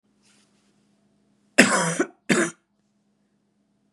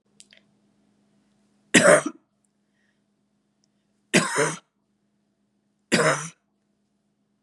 {"cough_length": "3.9 s", "cough_amplitude": 32768, "cough_signal_mean_std_ratio": 0.29, "three_cough_length": "7.4 s", "three_cough_amplitude": 27057, "three_cough_signal_mean_std_ratio": 0.27, "survey_phase": "beta (2021-08-13 to 2022-03-07)", "age": "45-64", "gender": "Female", "wearing_mask": "No", "symptom_sore_throat": true, "smoker_status": "Never smoked", "respiratory_condition_asthma": false, "respiratory_condition_other": false, "recruitment_source": "REACT", "submission_delay": "4 days", "covid_test_result": "Negative", "covid_test_method": "RT-qPCR", "influenza_a_test_result": "Negative", "influenza_b_test_result": "Negative"}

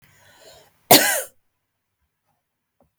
{"cough_length": "3.0 s", "cough_amplitude": 32768, "cough_signal_mean_std_ratio": 0.23, "survey_phase": "beta (2021-08-13 to 2022-03-07)", "age": "45-64", "gender": "Female", "wearing_mask": "No", "symptom_none": true, "smoker_status": "Never smoked", "respiratory_condition_asthma": false, "respiratory_condition_other": false, "recruitment_source": "REACT", "submission_delay": "2 days", "covid_test_result": "Negative", "covid_test_method": "RT-qPCR", "influenza_a_test_result": "Negative", "influenza_b_test_result": "Negative"}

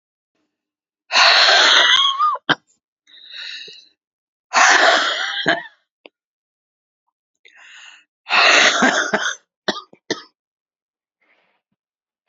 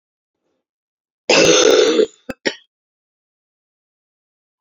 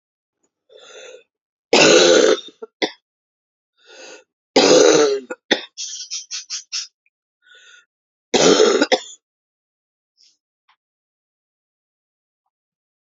{"exhalation_length": "12.3 s", "exhalation_amplitude": 32716, "exhalation_signal_mean_std_ratio": 0.43, "cough_length": "4.6 s", "cough_amplitude": 31587, "cough_signal_mean_std_ratio": 0.35, "three_cough_length": "13.1 s", "three_cough_amplitude": 32768, "three_cough_signal_mean_std_ratio": 0.34, "survey_phase": "beta (2021-08-13 to 2022-03-07)", "age": "45-64", "gender": "Female", "wearing_mask": "No", "symptom_cough_any": true, "symptom_runny_or_blocked_nose": true, "symptom_sore_throat": true, "symptom_abdominal_pain": true, "symptom_fatigue": true, "symptom_fever_high_temperature": true, "symptom_headache": true, "symptom_change_to_sense_of_smell_or_taste": true, "symptom_onset": "3 days", "smoker_status": "Never smoked", "respiratory_condition_asthma": false, "respiratory_condition_other": false, "recruitment_source": "Test and Trace", "submission_delay": "1 day", "covid_test_result": "Positive", "covid_test_method": "RT-qPCR", "covid_ct_value": 21.3, "covid_ct_gene": "N gene"}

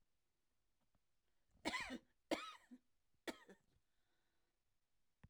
{"cough_length": "5.3 s", "cough_amplitude": 1506, "cough_signal_mean_std_ratio": 0.28, "survey_phase": "alpha (2021-03-01 to 2021-08-12)", "age": "65+", "gender": "Female", "wearing_mask": "No", "symptom_none": true, "smoker_status": "Never smoked", "respiratory_condition_asthma": false, "respiratory_condition_other": false, "recruitment_source": "REACT", "submission_delay": "2 days", "covid_test_result": "Negative", "covid_test_method": "RT-qPCR"}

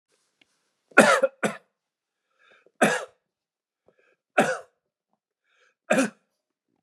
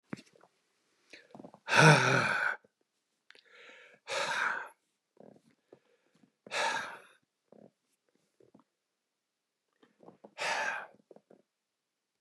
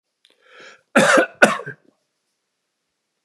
{"three_cough_length": "6.8 s", "three_cough_amplitude": 32753, "three_cough_signal_mean_std_ratio": 0.27, "exhalation_length": "12.2 s", "exhalation_amplitude": 13217, "exhalation_signal_mean_std_ratio": 0.29, "cough_length": "3.2 s", "cough_amplitude": 32768, "cough_signal_mean_std_ratio": 0.3, "survey_phase": "beta (2021-08-13 to 2022-03-07)", "age": "65+", "gender": "Male", "wearing_mask": "No", "symptom_none": true, "smoker_status": "Never smoked", "respiratory_condition_asthma": false, "respiratory_condition_other": false, "recruitment_source": "REACT", "submission_delay": "1 day", "covid_test_result": "Negative", "covid_test_method": "RT-qPCR", "influenza_a_test_result": "Negative", "influenza_b_test_result": "Negative"}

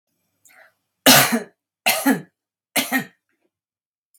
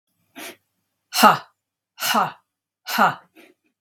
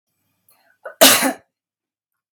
{"three_cough_length": "4.2 s", "three_cough_amplitude": 32767, "three_cough_signal_mean_std_ratio": 0.33, "exhalation_length": "3.8 s", "exhalation_amplitude": 32761, "exhalation_signal_mean_std_ratio": 0.32, "cough_length": "2.3 s", "cough_amplitude": 32768, "cough_signal_mean_std_ratio": 0.28, "survey_phase": "beta (2021-08-13 to 2022-03-07)", "age": "45-64", "gender": "Female", "wearing_mask": "No", "symptom_cough_any": true, "symptom_runny_or_blocked_nose": true, "symptom_onset": "3 days", "smoker_status": "Never smoked", "respiratory_condition_asthma": false, "respiratory_condition_other": false, "recruitment_source": "Test and Trace", "submission_delay": "1 day", "covid_test_result": "Positive", "covid_test_method": "RT-qPCR", "covid_ct_value": 22.0, "covid_ct_gene": "N gene"}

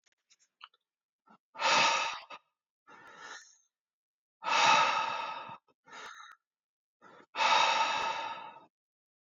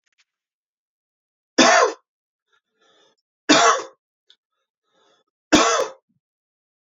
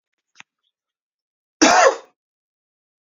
{"exhalation_length": "9.3 s", "exhalation_amplitude": 7902, "exhalation_signal_mean_std_ratio": 0.43, "three_cough_length": "6.9 s", "three_cough_amplitude": 30058, "three_cough_signal_mean_std_ratio": 0.3, "cough_length": "3.1 s", "cough_amplitude": 28037, "cough_signal_mean_std_ratio": 0.26, "survey_phase": "beta (2021-08-13 to 2022-03-07)", "age": "18-44", "gender": "Male", "wearing_mask": "No", "symptom_none": true, "symptom_onset": "12 days", "smoker_status": "Ex-smoker", "respiratory_condition_asthma": true, "respiratory_condition_other": false, "recruitment_source": "REACT", "submission_delay": "1 day", "covid_test_result": "Negative", "covid_test_method": "RT-qPCR", "influenza_a_test_result": "Negative", "influenza_b_test_result": "Negative"}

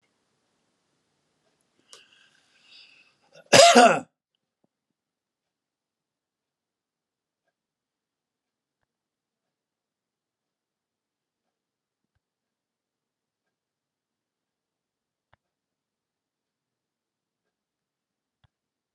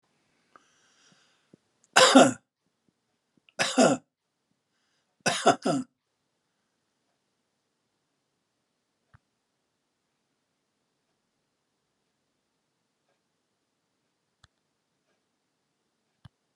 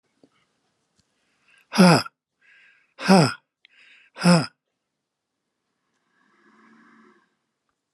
{"cough_length": "18.9 s", "cough_amplitude": 30393, "cough_signal_mean_std_ratio": 0.12, "three_cough_length": "16.6 s", "three_cough_amplitude": 27038, "three_cough_signal_mean_std_ratio": 0.18, "exhalation_length": "7.9 s", "exhalation_amplitude": 27986, "exhalation_signal_mean_std_ratio": 0.24, "survey_phase": "alpha (2021-03-01 to 2021-08-12)", "age": "65+", "gender": "Male", "wearing_mask": "No", "symptom_none": true, "smoker_status": "Ex-smoker", "respiratory_condition_asthma": false, "respiratory_condition_other": false, "recruitment_source": "REACT", "submission_delay": "1 day", "covid_test_result": "Negative", "covid_test_method": "RT-qPCR"}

